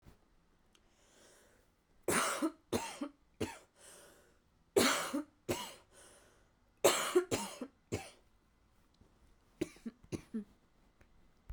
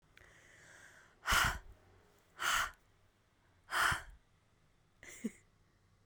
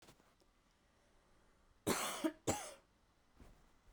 {"three_cough_length": "11.5 s", "three_cough_amplitude": 7197, "three_cough_signal_mean_std_ratio": 0.35, "exhalation_length": "6.1 s", "exhalation_amplitude": 4073, "exhalation_signal_mean_std_ratio": 0.36, "cough_length": "3.9 s", "cough_amplitude": 2629, "cough_signal_mean_std_ratio": 0.34, "survey_phase": "beta (2021-08-13 to 2022-03-07)", "age": "18-44", "gender": "Female", "wearing_mask": "No", "symptom_runny_or_blocked_nose": true, "symptom_sore_throat": true, "symptom_fatigue": true, "symptom_fever_high_temperature": true, "symptom_headache": true, "symptom_onset": "4 days", "smoker_status": "Never smoked", "respiratory_condition_asthma": false, "respiratory_condition_other": false, "recruitment_source": "Test and Trace", "submission_delay": "2 days", "covid_test_result": "Positive", "covid_test_method": "ePCR"}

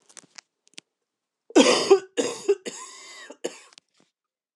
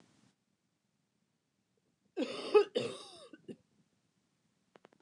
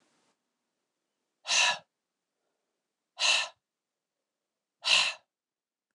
{"three_cough_length": "4.6 s", "three_cough_amplitude": 22949, "three_cough_signal_mean_std_ratio": 0.3, "cough_length": "5.0 s", "cough_amplitude": 6307, "cough_signal_mean_std_ratio": 0.23, "exhalation_length": "5.9 s", "exhalation_amplitude": 10237, "exhalation_signal_mean_std_ratio": 0.29, "survey_phase": "beta (2021-08-13 to 2022-03-07)", "age": "45-64", "gender": "Female", "wearing_mask": "No", "symptom_cough_any": true, "symptom_runny_or_blocked_nose": true, "symptom_headache": true, "symptom_other": true, "symptom_onset": "2 days", "smoker_status": "Never smoked", "respiratory_condition_asthma": false, "respiratory_condition_other": false, "recruitment_source": "Test and Trace", "submission_delay": "2 days", "covid_test_result": "Positive", "covid_test_method": "RT-qPCR"}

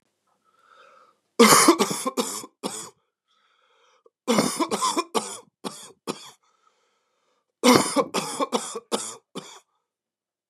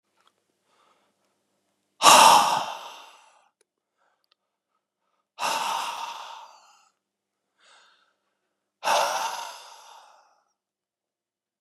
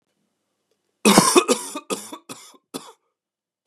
{"three_cough_length": "10.5 s", "three_cough_amplitude": 32767, "three_cough_signal_mean_std_ratio": 0.36, "exhalation_length": "11.6 s", "exhalation_amplitude": 32056, "exhalation_signal_mean_std_ratio": 0.27, "cough_length": "3.7 s", "cough_amplitude": 32768, "cough_signal_mean_std_ratio": 0.31, "survey_phase": "beta (2021-08-13 to 2022-03-07)", "age": "45-64", "gender": "Male", "wearing_mask": "Yes", "symptom_runny_or_blocked_nose": true, "symptom_headache": true, "symptom_onset": "6 days", "smoker_status": "Never smoked", "respiratory_condition_asthma": false, "respiratory_condition_other": false, "recruitment_source": "Test and Trace", "submission_delay": "2 days", "covid_test_result": "Positive", "covid_test_method": "RT-qPCR", "covid_ct_value": 20.9, "covid_ct_gene": "ORF1ab gene"}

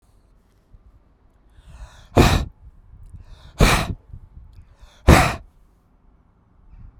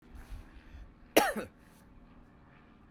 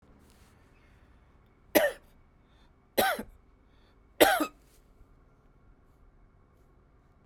{"exhalation_length": "7.0 s", "exhalation_amplitude": 32768, "exhalation_signal_mean_std_ratio": 0.29, "cough_length": "2.9 s", "cough_amplitude": 13956, "cough_signal_mean_std_ratio": 0.29, "three_cough_length": "7.3 s", "three_cough_amplitude": 19475, "three_cough_signal_mean_std_ratio": 0.25, "survey_phase": "beta (2021-08-13 to 2022-03-07)", "age": "45-64", "gender": "Male", "wearing_mask": "No", "symptom_none": true, "smoker_status": "Never smoked", "respiratory_condition_asthma": false, "respiratory_condition_other": false, "recruitment_source": "REACT", "submission_delay": "5 days", "covid_test_result": "Negative", "covid_test_method": "RT-qPCR"}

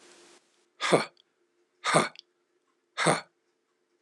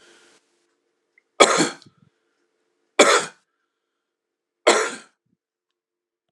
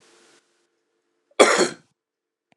{"exhalation_length": "4.0 s", "exhalation_amplitude": 15580, "exhalation_signal_mean_std_ratio": 0.3, "three_cough_length": "6.3 s", "three_cough_amplitude": 32768, "three_cough_signal_mean_std_ratio": 0.26, "cough_length": "2.6 s", "cough_amplitude": 32767, "cough_signal_mean_std_ratio": 0.25, "survey_phase": "beta (2021-08-13 to 2022-03-07)", "age": "45-64", "gender": "Male", "wearing_mask": "No", "symptom_runny_or_blocked_nose": true, "smoker_status": "Never smoked", "respiratory_condition_asthma": false, "respiratory_condition_other": false, "recruitment_source": "Test and Trace", "submission_delay": "0 days", "covid_test_result": "Negative", "covid_test_method": "LFT"}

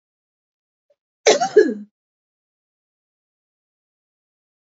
{"cough_length": "4.7 s", "cough_amplitude": 30120, "cough_signal_mean_std_ratio": 0.21, "survey_phase": "beta (2021-08-13 to 2022-03-07)", "age": "18-44", "gender": "Female", "wearing_mask": "No", "symptom_cough_any": true, "symptom_runny_or_blocked_nose": true, "symptom_sore_throat": true, "symptom_fatigue": true, "symptom_headache": true, "symptom_change_to_sense_of_smell_or_taste": true, "symptom_loss_of_taste": true, "symptom_onset": "2 days", "smoker_status": "Ex-smoker", "respiratory_condition_asthma": true, "respiratory_condition_other": false, "recruitment_source": "Test and Trace", "submission_delay": "2 days", "covid_test_result": "Positive", "covid_test_method": "RT-qPCR"}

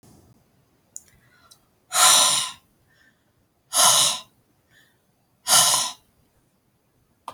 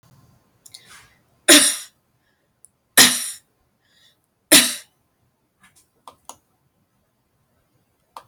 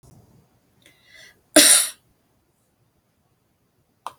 {"exhalation_length": "7.3 s", "exhalation_amplitude": 25924, "exhalation_signal_mean_std_ratio": 0.35, "three_cough_length": "8.3 s", "three_cough_amplitude": 32768, "three_cough_signal_mean_std_ratio": 0.22, "cough_length": "4.2 s", "cough_amplitude": 32768, "cough_signal_mean_std_ratio": 0.22, "survey_phase": "beta (2021-08-13 to 2022-03-07)", "age": "45-64", "gender": "Female", "wearing_mask": "No", "symptom_none": true, "smoker_status": "Never smoked", "respiratory_condition_asthma": false, "respiratory_condition_other": false, "recruitment_source": "REACT", "submission_delay": "1 day", "covid_test_result": "Negative", "covid_test_method": "RT-qPCR"}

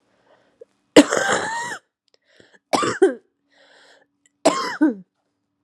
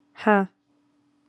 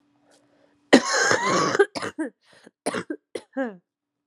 {"three_cough_length": "5.6 s", "three_cough_amplitude": 32768, "three_cough_signal_mean_std_ratio": 0.34, "exhalation_length": "1.3 s", "exhalation_amplitude": 21641, "exhalation_signal_mean_std_ratio": 0.28, "cough_length": "4.3 s", "cough_amplitude": 32526, "cough_signal_mean_std_ratio": 0.41, "survey_phase": "alpha (2021-03-01 to 2021-08-12)", "age": "18-44", "gender": "Female", "wearing_mask": "No", "symptom_cough_any": true, "symptom_fatigue": true, "symptom_headache": true, "symptom_onset": "4 days", "smoker_status": "Ex-smoker", "respiratory_condition_asthma": false, "respiratory_condition_other": false, "recruitment_source": "Test and Trace", "submission_delay": "2 days", "covid_test_result": "Positive", "covid_test_method": "RT-qPCR", "covid_ct_value": 25.0, "covid_ct_gene": "N gene"}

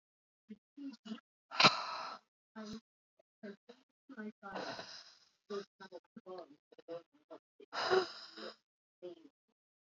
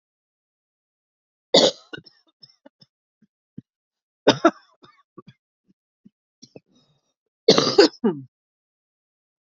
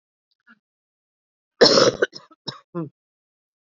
{"exhalation_length": "9.8 s", "exhalation_amplitude": 8957, "exhalation_signal_mean_std_ratio": 0.3, "cough_length": "9.5 s", "cough_amplitude": 31952, "cough_signal_mean_std_ratio": 0.21, "three_cough_length": "3.7 s", "three_cough_amplitude": 30875, "three_cough_signal_mean_std_ratio": 0.26, "survey_phase": "beta (2021-08-13 to 2022-03-07)", "age": "45-64", "gender": "Female", "wearing_mask": "No", "symptom_shortness_of_breath": true, "symptom_sore_throat": true, "symptom_fatigue": true, "symptom_headache": true, "symptom_onset": "3 days", "smoker_status": "Ex-smoker", "respiratory_condition_asthma": false, "respiratory_condition_other": false, "recruitment_source": "Test and Trace", "submission_delay": "1 day", "covid_test_result": "Positive", "covid_test_method": "RT-qPCR", "covid_ct_value": 23.4, "covid_ct_gene": "ORF1ab gene"}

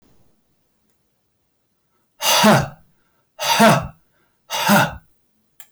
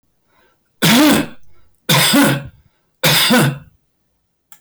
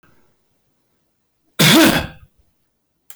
{"exhalation_length": "5.7 s", "exhalation_amplitude": 24271, "exhalation_signal_mean_std_ratio": 0.39, "three_cough_length": "4.6 s", "three_cough_amplitude": 25235, "three_cough_signal_mean_std_ratio": 0.54, "cough_length": "3.2 s", "cough_amplitude": 25268, "cough_signal_mean_std_ratio": 0.34, "survey_phase": "beta (2021-08-13 to 2022-03-07)", "age": "65+", "gender": "Male", "wearing_mask": "No", "symptom_none": true, "smoker_status": "Ex-smoker", "respiratory_condition_asthma": false, "respiratory_condition_other": false, "recruitment_source": "REACT", "submission_delay": "1 day", "covid_test_result": "Negative", "covid_test_method": "RT-qPCR"}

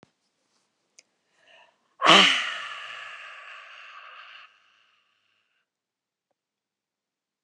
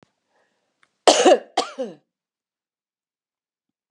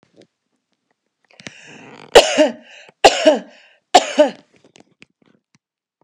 {"exhalation_length": "7.4 s", "exhalation_amplitude": 30799, "exhalation_signal_mean_std_ratio": 0.23, "cough_length": "3.9 s", "cough_amplitude": 32393, "cough_signal_mean_std_ratio": 0.25, "three_cough_length": "6.0 s", "three_cough_amplitude": 32768, "three_cough_signal_mean_std_ratio": 0.28, "survey_phase": "beta (2021-08-13 to 2022-03-07)", "age": "65+", "gender": "Female", "wearing_mask": "No", "symptom_runny_or_blocked_nose": true, "smoker_status": "Never smoked", "respiratory_condition_asthma": true, "respiratory_condition_other": false, "recruitment_source": "REACT", "submission_delay": "1 day", "covid_test_result": "Negative", "covid_test_method": "RT-qPCR", "influenza_a_test_result": "Negative", "influenza_b_test_result": "Negative"}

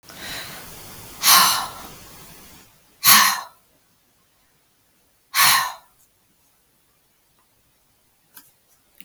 {"exhalation_length": "9.0 s", "exhalation_amplitude": 32766, "exhalation_signal_mean_std_ratio": 0.31, "survey_phase": "beta (2021-08-13 to 2022-03-07)", "age": "65+", "gender": "Female", "wearing_mask": "No", "symptom_none": true, "smoker_status": "Ex-smoker", "respiratory_condition_asthma": false, "respiratory_condition_other": false, "recruitment_source": "REACT", "submission_delay": "1 day", "covid_test_result": "Negative", "covid_test_method": "RT-qPCR"}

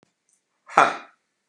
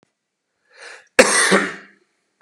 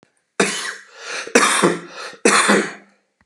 {"exhalation_length": "1.5 s", "exhalation_amplitude": 32687, "exhalation_signal_mean_std_ratio": 0.24, "cough_length": "2.4 s", "cough_amplitude": 32768, "cough_signal_mean_std_ratio": 0.35, "three_cough_length": "3.3 s", "three_cough_amplitude": 32767, "three_cough_signal_mean_std_ratio": 0.52, "survey_phase": "beta (2021-08-13 to 2022-03-07)", "age": "45-64", "gender": "Male", "wearing_mask": "No", "symptom_cough_any": true, "symptom_sore_throat": true, "symptom_onset": "2 days", "smoker_status": "Never smoked", "respiratory_condition_asthma": false, "respiratory_condition_other": false, "recruitment_source": "Test and Trace", "submission_delay": "1 day", "covid_test_result": "Positive", "covid_test_method": "RT-qPCR", "covid_ct_value": 16.7, "covid_ct_gene": "ORF1ab gene", "covid_ct_mean": 16.9, "covid_viral_load": "2800000 copies/ml", "covid_viral_load_category": "High viral load (>1M copies/ml)"}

